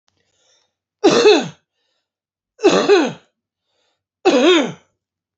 {"three_cough_length": "5.4 s", "three_cough_amplitude": 29740, "three_cough_signal_mean_std_ratio": 0.41, "survey_phase": "alpha (2021-03-01 to 2021-08-12)", "age": "65+", "gender": "Male", "wearing_mask": "No", "symptom_none": true, "smoker_status": "Ex-smoker", "respiratory_condition_asthma": false, "respiratory_condition_other": false, "recruitment_source": "REACT", "submission_delay": "1 day", "covid_test_result": "Negative", "covid_test_method": "RT-qPCR"}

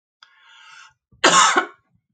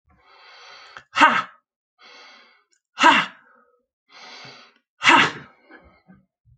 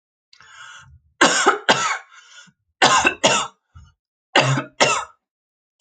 {"cough_length": "2.1 s", "cough_amplitude": 31280, "cough_signal_mean_std_ratio": 0.36, "exhalation_length": "6.6 s", "exhalation_amplitude": 29629, "exhalation_signal_mean_std_ratio": 0.29, "three_cough_length": "5.8 s", "three_cough_amplitude": 32768, "three_cough_signal_mean_std_ratio": 0.43, "survey_phase": "alpha (2021-03-01 to 2021-08-12)", "age": "45-64", "gender": "Female", "wearing_mask": "No", "symptom_diarrhoea": true, "symptom_fatigue": true, "smoker_status": "Never smoked", "respiratory_condition_asthma": false, "respiratory_condition_other": false, "recruitment_source": "REACT", "submission_delay": "4 days", "covid_test_result": "Negative", "covid_test_method": "RT-qPCR"}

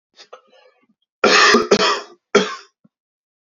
{"three_cough_length": "3.5 s", "three_cough_amplitude": 32428, "three_cough_signal_mean_std_ratio": 0.4, "survey_phase": "alpha (2021-03-01 to 2021-08-12)", "age": "18-44", "gender": "Male", "wearing_mask": "No", "symptom_fever_high_temperature": true, "smoker_status": "Current smoker (e-cigarettes or vapes only)", "respiratory_condition_asthma": false, "respiratory_condition_other": false, "recruitment_source": "Test and Trace", "submission_delay": "1 day", "covid_test_result": "Positive", "covid_test_method": "RT-qPCR", "covid_ct_value": 14.8, "covid_ct_gene": "ORF1ab gene", "covid_ct_mean": 15.4, "covid_viral_load": "8700000 copies/ml", "covid_viral_load_category": "High viral load (>1M copies/ml)"}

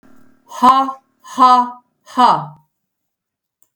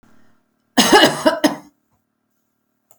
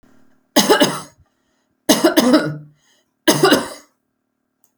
{"exhalation_length": "3.8 s", "exhalation_amplitude": 32768, "exhalation_signal_mean_std_ratio": 0.4, "cough_length": "3.0 s", "cough_amplitude": 32768, "cough_signal_mean_std_ratio": 0.35, "three_cough_length": "4.8 s", "three_cough_amplitude": 32768, "three_cough_signal_mean_std_ratio": 0.42, "survey_phase": "beta (2021-08-13 to 2022-03-07)", "age": "65+", "gender": "Female", "wearing_mask": "No", "symptom_none": true, "smoker_status": "Never smoked", "respiratory_condition_asthma": false, "respiratory_condition_other": false, "recruitment_source": "REACT", "submission_delay": "1 day", "covid_test_result": "Negative", "covid_test_method": "RT-qPCR", "influenza_a_test_result": "Negative", "influenza_b_test_result": "Negative"}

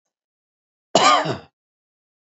{"cough_length": "2.4 s", "cough_amplitude": 27680, "cough_signal_mean_std_ratio": 0.31, "survey_phase": "beta (2021-08-13 to 2022-03-07)", "age": "65+", "gender": "Male", "wearing_mask": "Yes", "symptom_runny_or_blocked_nose": true, "symptom_shortness_of_breath": true, "symptom_fatigue": true, "symptom_headache": true, "symptom_onset": "12 days", "smoker_status": "Ex-smoker", "respiratory_condition_asthma": true, "respiratory_condition_other": false, "recruitment_source": "REACT", "submission_delay": "1 day", "covid_test_result": "Negative", "covid_test_method": "RT-qPCR", "influenza_a_test_result": "Negative", "influenza_b_test_result": "Negative"}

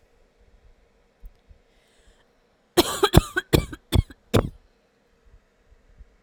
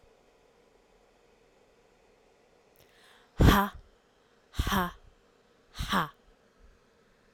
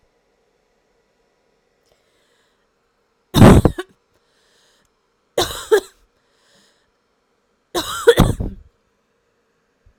{"cough_length": "6.2 s", "cough_amplitude": 32768, "cough_signal_mean_std_ratio": 0.24, "exhalation_length": "7.3 s", "exhalation_amplitude": 14604, "exhalation_signal_mean_std_ratio": 0.26, "three_cough_length": "10.0 s", "three_cough_amplitude": 32768, "three_cough_signal_mean_std_ratio": 0.23, "survey_phase": "alpha (2021-03-01 to 2021-08-12)", "age": "18-44", "gender": "Female", "wearing_mask": "No", "symptom_cough_any": true, "symptom_new_continuous_cough": true, "symptom_fatigue": true, "symptom_fever_high_temperature": true, "symptom_change_to_sense_of_smell_or_taste": true, "symptom_onset": "3 days", "smoker_status": "Never smoked", "respiratory_condition_asthma": false, "respiratory_condition_other": false, "recruitment_source": "Test and Trace", "submission_delay": "2 days", "covid_test_result": "Positive", "covid_test_method": "RT-qPCR", "covid_ct_value": 12.5, "covid_ct_gene": "S gene", "covid_ct_mean": 13.3, "covid_viral_load": "45000000 copies/ml", "covid_viral_load_category": "High viral load (>1M copies/ml)"}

